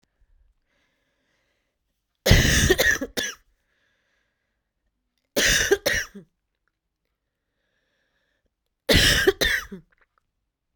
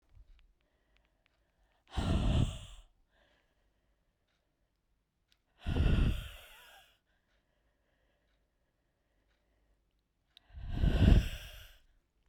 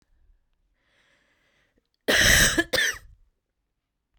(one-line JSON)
{"three_cough_length": "10.8 s", "three_cough_amplitude": 32767, "three_cough_signal_mean_std_ratio": 0.34, "exhalation_length": "12.3 s", "exhalation_amplitude": 10397, "exhalation_signal_mean_std_ratio": 0.31, "cough_length": "4.2 s", "cough_amplitude": 17292, "cough_signal_mean_std_ratio": 0.34, "survey_phase": "beta (2021-08-13 to 2022-03-07)", "age": "18-44", "gender": "Female", "wearing_mask": "No", "symptom_cough_any": true, "symptom_runny_or_blocked_nose": true, "symptom_fatigue": true, "smoker_status": "Ex-smoker", "respiratory_condition_asthma": false, "respiratory_condition_other": false, "recruitment_source": "Test and Trace", "submission_delay": "2 days", "covid_test_result": "Positive", "covid_test_method": "RT-qPCR", "covid_ct_value": 25.4, "covid_ct_gene": "ORF1ab gene", "covid_ct_mean": 26.3, "covid_viral_load": "2300 copies/ml", "covid_viral_load_category": "Minimal viral load (< 10K copies/ml)"}